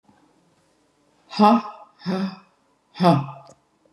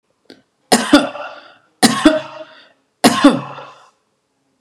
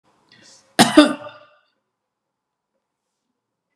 {
  "exhalation_length": "3.9 s",
  "exhalation_amplitude": 28516,
  "exhalation_signal_mean_std_ratio": 0.34,
  "three_cough_length": "4.6 s",
  "three_cough_amplitude": 32768,
  "three_cough_signal_mean_std_ratio": 0.37,
  "cough_length": "3.8 s",
  "cough_amplitude": 32768,
  "cough_signal_mean_std_ratio": 0.21,
  "survey_phase": "beta (2021-08-13 to 2022-03-07)",
  "age": "65+",
  "gender": "Female",
  "wearing_mask": "No",
  "symptom_none": true,
  "smoker_status": "Never smoked",
  "respiratory_condition_asthma": false,
  "respiratory_condition_other": false,
  "recruitment_source": "REACT",
  "submission_delay": "-1 day",
  "covid_test_result": "Negative",
  "covid_test_method": "RT-qPCR",
  "influenza_a_test_result": "Negative",
  "influenza_b_test_result": "Negative"
}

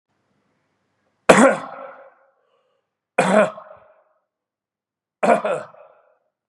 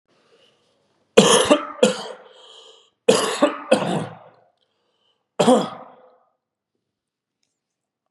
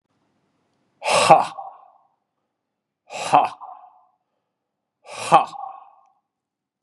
{
  "three_cough_length": "6.5 s",
  "three_cough_amplitude": 32768,
  "three_cough_signal_mean_std_ratio": 0.29,
  "cough_length": "8.1 s",
  "cough_amplitude": 32768,
  "cough_signal_mean_std_ratio": 0.34,
  "exhalation_length": "6.8 s",
  "exhalation_amplitude": 32768,
  "exhalation_signal_mean_std_ratio": 0.27,
  "survey_phase": "beta (2021-08-13 to 2022-03-07)",
  "age": "45-64",
  "gender": "Male",
  "wearing_mask": "No",
  "symptom_cough_any": true,
  "symptom_new_continuous_cough": true,
  "symptom_sore_throat": true,
  "symptom_headache": true,
  "smoker_status": "Never smoked",
  "respiratory_condition_asthma": false,
  "respiratory_condition_other": false,
  "recruitment_source": "Test and Trace",
  "submission_delay": "1 day",
  "covid_test_result": "Positive",
  "covid_test_method": "ePCR"
}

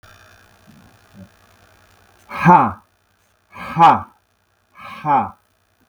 {
  "exhalation_length": "5.9 s",
  "exhalation_amplitude": 32768,
  "exhalation_signal_mean_std_ratio": 0.31,
  "survey_phase": "beta (2021-08-13 to 2022-03-07)",
  "age": "45-64",
  "gender": "Male",
  "wearing_mask": "No",
  "symptom_none": true,
  "smoker_status": "Never smoked",
  "respiratory_condition_asthma": false,
  "respiratory_condition_other": false,
  "recruitment_source": "REACT",
  "submission_delay": "2 days",
  "covid_test_result": "Negative",
  "covid_test_method": "RT-qPCR"
}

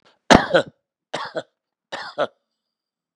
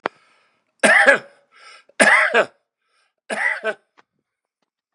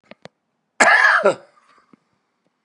{
  "exhalation_length": "3.2 s",
  "exhalation_amplitude": 32768,
  "exhalation_signal_mean_std_ratio": 0.26,
  "three_cough_length": "4.9 s",
  "three_cough_amplitude": 32767,
  "three_cough_signal_mean_std_ratio": 0.36,
  "cough_length": "2.6 s",
  "cough_amplitude": 32765,
  "cough_signal_mean_std_ratio": 0.37,
  "survey_phase": "beta (2021-08-13 to 2022-03-07)",
  "age": "65+",
  "gender": "Male",
  "wearing_mask": "No",
  "symptom_cough_any": true,
  "symptom_shortness_of_breath": true,
  "symptom_diarrhoea": true,
  "symptom_fatigue": true,
  "symptom_change_to_sense_of_smell_or_taste": true,
  "symptom_onset": "4 days",
  "smoker_status": "Ex-smoker",
  "respiratory_condition_asthma": true,
  "respiratory_condition_other": true,
  "recruitment_source": "Test and Trace",
  "submission_delay": "1 day",
  "covid_test_result": "Positive",
  "covid_test_method": "ePCR"
}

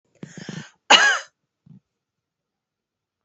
{
  "cough_length": "3.2 s",
  "cough_amplitude": 31205,
  "cough_signal_mean_std_ratio": 0.25,
  "survey_phase": "alpha (2021-03-01 to 2021-08-12)",
  "age": "45-64",
  "gender": "Female",
  "wearing_mask": "No",
  "symptom_change_to_sense_of_smell_or_taste": true,
  "symptom_loss_of_taste": true,
  "symptom_onset": "2 days",
  "smoker_status": "Ex-smoker",
  "respiratory_condition_asthma": false,
  "respiratory_condition_other": false,
  "recruitment_source": "Test and Trace",
  "submission_delay": "1 day",
  "covid_test_result": "Positive",
  "covid_test_method": "RT-qPCR",
  "covid_ct_value": 21.1,
  "covid_ct_gene": "ORF1ab gene",
  "covid_ct_mean": 21.5,
  "covid_viral_load": "89000 copies/ml",
  "covid_viral_load_category": "Low viral load (10K-1M copies/ml)"
}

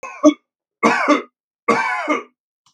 {
  "three_cough_length": "2.7 s",
  "three_cough_amplitude": 32767,
  "three_cough_signal_mean_std_ratio": 0.47,
  "survey_phase": "beta (2021-08-13 to 2022-03-07)",
  "age": "65+",
  "gender": "Male",
  "wearing_mask": "No",
  "symptom_none": true,
  "smoker_status": "Never smoked",
  "respiratory_condition_asthma": false,
  "respiratory_condition_other": false,
  "recruitment_source": "REACT",
  "submission_delay": "3 days",
  "covid_test_result": "Negative",
  "covid_test_method": "RT-qPCR",
  "influenza_a_test_result": "Negative",
  "influenza_b_test_result": "Negative"
}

